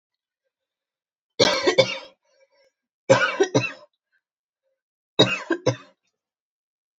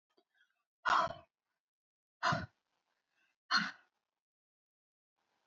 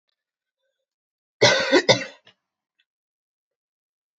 {"three_cough_length": "7.0 s", "three_cough_amplitude": 27263, "three_cough_signal_mean_std_ratio": 0.32, "exhalation_length": "5.5 s", "exhalation_amplitude": 3821, "exhalation_signal_mean_std_ratio": 0.27, "cough_length": "4.2 s", "cough_amplitude": 27451, "cough_signal_mean_std_ratio": 0.26, "survey_phase": "alpha (2021-03-01 to 2021-08-12)", "age": "18-44", "wearing_mask": "No", "symptom_headache": true, "smoker_status": "Never smoked", "respiratory_condition_asthma": false, "respiratory_condition_other": false, "recruitment_source": "Test and Trace", "submission_delay": "2 days", "covid_test_result": "Positive", "covid_test_method": "RT-qPCR"}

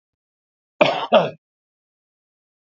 {"cough_length": "2.6 s", "cough_amplitude": 27708, "cough_signal_mean_std_ratio": 0.28, "survey_phase": "beta (2021-08-13 to 2022-03-07)", "age": "45-64", "gender": "Male", "wearing_mask": "No", "symptom_cough_any": true, "symptom_runny_or_blocked_nose": true, "symptom_fatigue": true, "smoker_status": "Never smoked", "respiratory_condition_asthma": false, "respiratory_condition_other": false, "recruitment_source": "Test and Trace", "submission_delay": "2 days", "covid_test_result": "Positive", "covid_test_method": "RT-qPCR", "covid_ct_value": 22.1, "covid_ct_gene": "ORF1ab gene"}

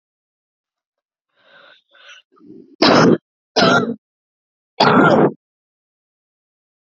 {"three_cough_length": "6.9 s", "three_cough_amplitude": 32767, "three_cough_signal_mean_std_ratio": 0.35, "survey_phase": "alpha (2021-03-01 to 2021-08-12)", "age": "18-44", "gender": "Female", "wearing_mask": "No", "symptom_headache": true, "smoker_status": "Never smoked", "respiratory_condition_asthma": false, "respiratory_condition_other": false, "recruitment_source": "Test and Trace", "submission_delay": "2 days", "covid_test_result": "Positive", "covid_test_method": "RT-qPCR", "covid_ct_value": 26.2, "covid_ct_gene": "N gene"}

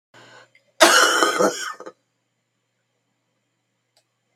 {"cough_length": "4.4 s", "cough_amplitude": 32766, "cough_signal_mean_std_ratio": 0.33, "survey_phase": "beta (2021-08-13 to 2022-03-07)", "age": "65+", "gender": "Female", "wearing_mask": "No", "symptom_cough_any": true, "symptom_runny_or_blocked_nose": true, "symptom_sore_throat": true, "symptom_onset": "2 days", "smoker_status": "Ex-smoker", "respiratory_condition_asthma": false, "respiratory_condition_other": false, "recruitment_source": "Test and Trace", "submission_delay": "1 day", "covid_test_result": "Positive", "covid_test_method": "RT-qPCR", "covid_ct_value": 17.9, "covid_ct_gene": "N gene"}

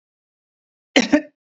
{"cough_length": "1.5 s", "cough_amplitude": 28877, "cough_signal_mean_std_ratio": 0.27, "survey_phase": "beta (2021-08-13 to 2022-03-07)", "age": "18-44", "gender": "Female", "wearing_mask": "No", "symptom_none": true, "smoker_status": "Never smoked", "respiratory_condition_asthma": false, "respiratory_condition_other": false, "recruitment_source": "REACT", "submission_delay": "4 days", "covid_test_result": "Negative", "covid_test_method": "RT-qPCR", "influenza_a_test_result": "Negative", "influenza_b_test_result": "Negative"}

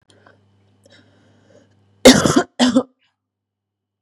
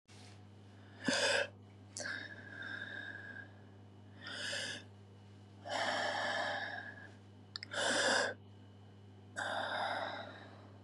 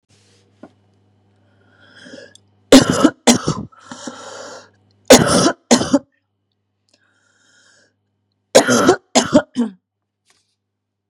{"cough_length": "4.0 s", "cough_amplitude": 32768, "cough_signal_mean_std_ratio": 0.28, "exhalation_length": "10.8 s", "exhalation_amplitude": 3574, "exhalation_signal_mean_std_ratio": 0.65, "three_cough_length": "11.1 s", "three_cough_amplitude": 32768, "three_cough_signal_mean_std_ratio": 0.32, "survey_phase": "beta (2021-08-13 to 2022-03-07)", "age": "45-64", "gender": "Female", "wearing_mask": "No", "symptom_cough_any": true, "symptom_runny_or_blocked_nose": true, "symptom_sore_throat": true, "symptom_abdominal_pain": true, "symptom_fever_high_temperature": true, "symptom_headache": true, "symptom_onset": "4 days", "smoker_status": "Never smoked", "respiratory_condition_asthma": false, "respiratory_condition_other": false, "recruitment_source": "Test and Trace", "submission_delay": "2 days", "covid_test_result": "Positive", "covid_test_method": "RT-qPCR", "covid_ct_value": 24.2, "covid_ct_gene": "ORF1ab gene", "covid_ct_mean": 24.3, "covid_viral_load": "11000 copies/ml", "covid_viral_load_category": "Low viral load (10K-1M copies/ml)"}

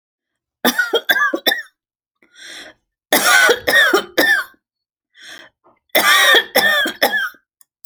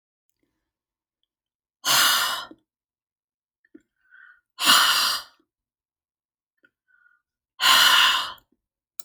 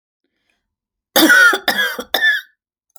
{"three_cough_length": "7.9 s", "three_cough_amplitude": 32768, "three_cough_signal_mean_std_ratio": 0.52, "exhalation_length": "9.0 s", "exhalation_amplitude": 24332, "exhalation_signal_mean_std_ratio": 0.36, "cough_length": "3.0 s", "cough_amplitude": 32768, "cough_signal_mean_std_ratio": 0.47, "survey_phase": "alpha (2021-03-01 to 2021-08-12)", "age": "45-64", "gender": "Female", "wearing_mask": "No", "symptom_none": true, "smoker_status": "Ex-smoker", "respiratory_condition_asthma": false, "respiratory_condition_other": false, "recruitment_source": "REACT", "submission_delay": "2 days", "covid_test_result": "Negative", "covid_test_method": "RT-qPCR"}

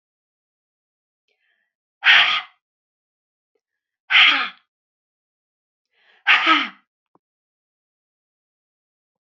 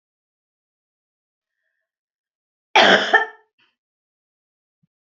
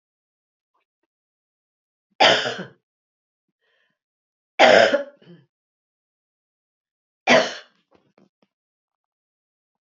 {"exhalation_length": "9.3 s", "exhalation_amplitude": 28251, "exhalation_signal_mean_std_ratio": 0.26, "cough_length": "5.0 s", "cough_amplitude": 31131, "cough_signal_mean_std_ratio": 0.23, "three_cough_length": "9.9 s", "three_cough_amplitude": 28672, "three_cough_signal_mean_std_ratio": 0.24, "survey_phase": "beta (2021-08-13 to 2022-03-07)", "age": "65+", "gender": "Female", "wearing_mask": "No", "symptom_sore_throat": true, "smoker_status": "Ex-smoker", "respiratory_condition_asthma": false, "respiratory_condition_other": false, "recruitment_source": "REACT", "submission_delay": "1 day", "covid_test_result": "Negative", "covid_test_method": "RT-qPCR", "influenza_a_test_result": "Negative", "influenza_b_test_result": "Negative"}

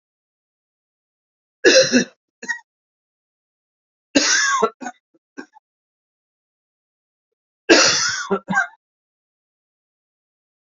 {"three_cough_length": "10.7 s", "three_cough_amplitude": 30949, "three_cough_signal_mean_std_ratio": 0.31, "survey_phase": "alpha (2021-03-01 to 2021-08-12)", "age": "45-64", "gender": "Male", "wearing_mask": "No", "symptom_cough_any": true, "symptom_headache": true, "symptom_change_to_sense_of_smell_or_taste": true, "symptom_loss_of_taste": true, "symptom_onset": "4 days", "smoker_status": "Never smoked", "respiratory_condition_asthma": false, "respiratory_condition_other": false, "recruitment_source": "Test and Trace", "submission_delay": "2 days", "covid_test_result": "Positive", "covid_test_method": "RT-qPCR", "covid_ct_value": 14.2, "covid_ct_gene": "ORF1ab gene", "covid_ct_mean": 14.9, "covid_viral_load": "13000000 copies/ml", "covid_viral_load_category": "High viral load (>1M copies/ml)"}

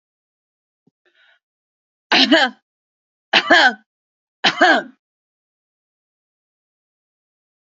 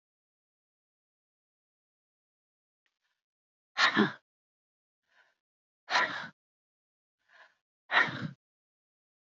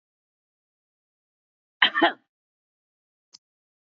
{"three_cough_length": "7.8 s", "three_cough_amplitude": 32114, "three_cough_signal_mean_std_ratio": 0.28, "exhalation_length": "9.2 s", "exhalation_amplitude": 8729, "exhalation_signal_mean_std_ratio": 0.23, "cough_length": "3.9 s", "cough_amplitude": 27230, "cough_signal_mean_std_ratio": 0.18, "survey_phase": "beta (2021-08-13 to 2022-03-07)", "age": "65+", "gender": "Female", "wearing_mask": "No", "symptom_none": true, "smoker_status": "Ex-smoker", "respiratory_condition_asthma": false, "respiratory_condition_other": false, "recruitment_source": "REACT", "submission_delay": "1 day", "covid_test_result": "Negative", "covid_test_method": "RT-qPCR"}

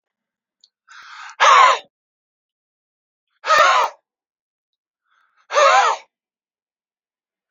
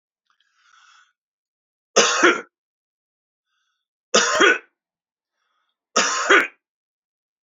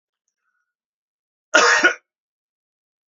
{"exhalation_length": "7.5 s", "exhalation_amplitude": 28429, "exhalation_signal_mean_std_ratio": 0.33, "three_cough_length": "7.4 s", "three_cough_amplitude": 32767, "three_cough_signal_mean_std_ratio": 0.32, "cough_length": "3.2 s", "cough_amplitude": 32767, "cough_signal_mean_std_ratio": 0.27, "survey_phase": "beta (2021-08-13 to 2022-03-07)", "age": "65+", "gender": "Male", "wearing_mask": "No", "symptom_none": true, "smoker_status": "Never smoked", "respiratory_condition_asthma": false, "respiratory_condition_other": false, "recruitment_source": "REACT", "submission_delay": "1 day", "covid_test_result": "Negative", "covid_test_method": "RT-qPCR", "influenza_a_test_result": "Negative", "influenza_b_test_result": "Negative"}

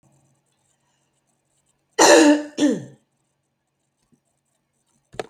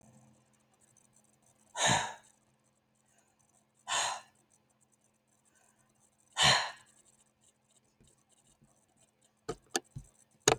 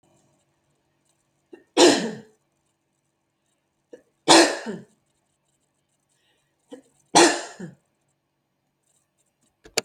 {"cough_length": "5.3 s", "cough_amplitude": 32767, "cough_signal_mean_std_ratio": 0.28, "exhalation_length": "10.6 s", "exhalation_amplitude": 16759, "exhalation_signal_mean_std_ratio": 0.25, "three_cough_length": "9.8 s", "three_cough_amplitude": 29241, "three_cough_signal_mean_std_ratio": 0.23, "survey_phase": "alpha (2021-03-01 to 2021-08-12)", "age": "45-64", "gender": "Female", "wearing_mask": "No", "symptom_none": true, "smoker_status": "Never smoked", "respiratory_condition_asthma": true, "respiratory_condition_other": false, "recruitment_source": "REACT", "submission_delay": "1 day", "covid_test_result": "Negative", "covid_test_method": "RT-qPCR"}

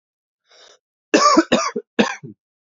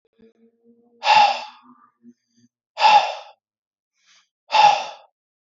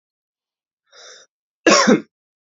{"three_cough_length": "2.7 s", "three_cough_amplitude": 27902, "three_cough_signal_mean_std_ratio": 0.38, "exhalation_length": "5.5 s", "exhalation_amplitude": 25214, "exhalation_signal_mean_std_ratio": 0.35, "cough_length": "2.6 s", "cough_amplitude": 30223, "cough_signal_mean_std_ratio": 0.29, "survey_phase": "alpha (2021-03-01 to 2021-08-12)", "age": "18-44", "gender": "Male", "wearing_mask": "No", "symptom_cough_any": true, "symptom_change_to_sense_of_smell_or_taste": true, "symptom_onset": "4 days", "smoker_status": "Never smoked", "respiratory_condition_asthma": false, "respiratory_condition_other": false, "recruitment_source": "Test and Trace", "submission_delay": "1 day", "covid_test_result": "Positive", "covid_test_method": "RT-qPCR", "covid_ct_value": 15.7, "covid_ct_gene": "ORF1ab gene", "covid_ct_mean": 16.2, "covid_viral_load": "5000000 copies/ml", "covid_viral_load_category": "High viral load (>1M copies/ml)"}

